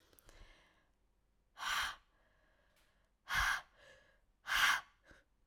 {"exhalation_length": "5.5 s", "exhalation_amplitude": 4034, "exhalation_signal_mean_std_ratio": 0.35, "survey_phase": "alpha (2021-03-01 to 2021-08-12)", "age": "18-44", "gender": "Female", "wearing_mask": "No", "symptom_shortness_of_breath": true, "symptom_headache": true, "symptom_change_to_sense_of_smell_or_taste": true, "symptom_loss_of_taste": true, "symptom_onset": "3 days", "smoker_status": "Ex-smoker", "respiratory_condition_asthma": false, "respiratory_condition_other": false, "recruitment_source": "Test and Trace", "submission_delay": "2 days", "covid_test_result": "Positive", "covid_test_method": "RT-qPCR", "covid_ct_value": 12.4, "covid_ct_gene": "N gene", "covid_ct_mean": 12.7, "covid_viral_load": "70000000 copies/ml", "covid_viral_load_category": "High viral load (>1M copies/ml)"}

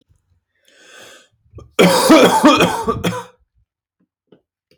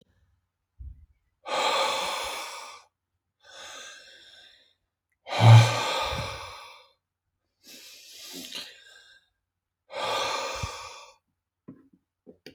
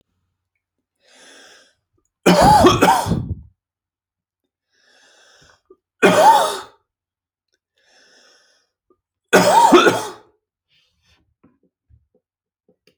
{"cough_length": "4.8 s", "cough_amplitude": 32115, "cough_signal_mean_std_ratio": 0.42, "exhalation_length": "12.5 s", "exhalation_amplitude": 20996, "exhalation_signal_mean_std_ratio": 0.31, "three_cough_length": "13.0 s", "three_cough_amplitude": 32767, "three_cough_signal_mean_std_ratio": 0.33, "survey_phase": "alpha (2021-03-01 to 2021-08-12)", "age": "18-44", "gender": "Male", "wearing_mask": "No", "symptom_none": true, "smoker_status": "Never smoked", "respiratory_condition_asthma": false, "respiratory_condition_other": false, "recruitment_source": "REACT", "submission_delay": "3 days", "covid_test_result": "Negative", "covid_test_method": "RT-qPCR"}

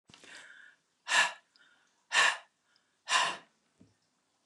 {"exhalation_length": "4.5 s", "exhalation_amplitude": 8470, "exhalation_signal_mean_std_ratio": 0.33, "survey_phase": "alpha (2021-03-01 to 2021-08-12)", "age": "65+", "gender": "Female", "wearing_mask": "No", "symptom_none": true, "smoker_status": "Never smoked", "respiratory_condition_asthma": false, "respiratory_condition_other": false, "recruitment_source": "REACT", "submission_delay": "2 days", "covid_test_result": "Negative", "covid_test_method": "RT-qPCR"}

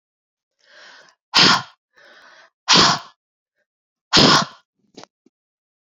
{"exhalation_length": "5.8 s", "exhalation_amplitude": 32768, "exhalation_signal_mean_std_ratio": 0.32, "survey_phase": "beta (2021-08-13 to 2022-03-07)", "age": "18-44", "gender": "Female", "wearing_mask": "No", "symptom_cough_any": true, "symptom_runny_or_blocked_nose": true, "symptom_fatigue": true, "symptom_headache": true, "symptom_change_to_sense_of_smell_or_taste": true, "symptom_onset": "12 days", "smoker_status": "Ex-smoker", "respiratory_condition_asthma": false, "respiratory_condition_other": false, "recruitment_source": "REACT", "submission_delay": "1 day", "covid_test_result": "Positive", "covid_test_method": "RT-qPCR", "covid_ct_value": 23.0, "covid_ct_gene": "E gene"}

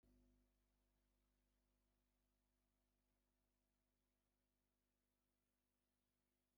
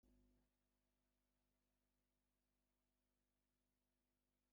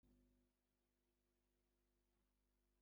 {"three_cough_length": "6.6 s", "three_cough_amplitude": 15, "three_cough_signal_mean_std_ratio": 0.75, "exhalation_length": "4.5 s", "exhalation_amplitude": 14, "exhalation_signal_mean_std_ratio": 0.66, "cough_length": "2.8 s", "cough_amplitude": 16, "cough_signal_mean_std_ratio": 0.85, "survey_phase": "beta (2021-08-13 to 2022-03-07)", "age": "45-64", "gender": "Male", "wearing_mask": "No", "symptom_none": true, "smoker_status": "Ex-smoker", "respiratory_condition_asthma": false, "respiratory_condition_other": false, "recruitment_source": "REACT", "submission_delay": "2 days", "covid_test_result": "Negative", "covid_test_method": "RT-qPCR", "influenza_a_test_result": "Negative", "influenza_b_test_result": "Negative"}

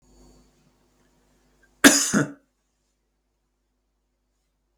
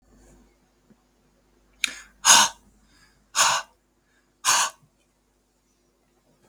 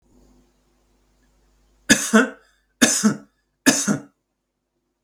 {"cough_length": "4.8 s", "cough_amplitude": 32768, "cough_signal_mean_std_ratio": 0.2, "exhalation_length": "6.5 s", "exhalation_amplitude": 32410, "exhalation_signal_mean_std_ratio": 0.26, "three_cough_length": "5.0 s", "three_cough_amplitude": 32768, "three_cough_signal_mean_std_ratio": 0.32, "survey_phase": "beta (2021-08-13 to 2022-03-07)", "age": "45-64", "gender": "Male", "wearing_mask": "No", "symptom_none": true, "smoker_status": "Ex-smoker", "respiratory_condition_asthma": false, "respiratory_condition_other": false, "recruitment_source": "REACT", "submission_delay": "2 days", "covid_test_result": "Negative", "covid_test_method": "RT-qPCR", "influenza_a_test_result": "Negative", "influenza_b_test_result": "Negative"}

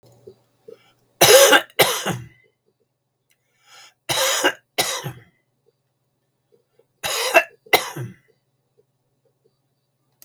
{"three_cough_length": "10.2 s", "three_cough_amplitude": 32768, "three_cough_signal_mean_std_ratio": 0.31, "survey_phase": "beta (2021-08-13 to 2022-03-07)", "age": "65+", "gender": "Male", "wearing_mask": "No", "symptom_cough_any": true, "symptom_fatigue": true, "symptom_other": true, "symptom_onset": "12 days", "smoker_status": "Ex-smoker", "respiratory_condition_asthma": true, "respiratory_condition_other": true, "recruitment_source": "REACT", "submission_delay": "2 days", "covid_test_result": "Negative", "covid_test_method": "RT-qPCR", "influenza_a_test_result": "Negative", "influenza_b_test_result": "Negative"}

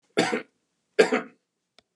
{"three_cough_length": "2.0 s", "three_cough_amplitude": 23498, "three_cough_signal_mean_std_ratio": 0.33, "survey_phase": "beta (2021-08-13 to 2022-03-07)", "age": "65+", "gender": "Male", "wearing_mask": "No", "symptom_none": true, "smoker_status": "Ex-smoker", "respiratory_condition_asthma": false, "respiratory_condition_other": false, "recruitment_source": "REACT", "submission_delay": "1 day", "covid_test_result": "Negative", "covid_test_method": "RT-qPCR", "influenza_a_test_result": "Negative", "influenza_b_test_result": "Negative"}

